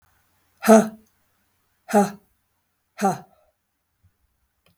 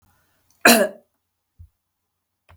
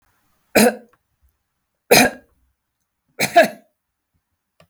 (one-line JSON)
{"exhalation_length": "4.8 s", "exhalation_amplitude": 32188, "exhalation_signal_mean_std_ratio": 0.24, "cough_length": "2.6 s", "cough_amplitude": 32768, "cough_signal_mean_std_ratio": 0.23, "three_cough_length": "4.7 s", "three_cough_amplitude": 32768, "three_cough_signal_mean_std_ratio": 0.27, "survey_phase": "beta (2021-08-13 to 2022-03-07)", "age": "45-64", "gender": "Female", "wearing_mask": "No", "symptom_none": true, "smoker_status": "Never smoked", "respiratory_condition_asthma": false, "respiratory_condition_other": false, "recruitment_source": "REACT", "submission_delay": "3 days", "covid_test_result": "Negative", "covid_test_method": "RT-qPCR", "influenza_a_test_result": "Negative", "influenza_b_test_result": "Negative"}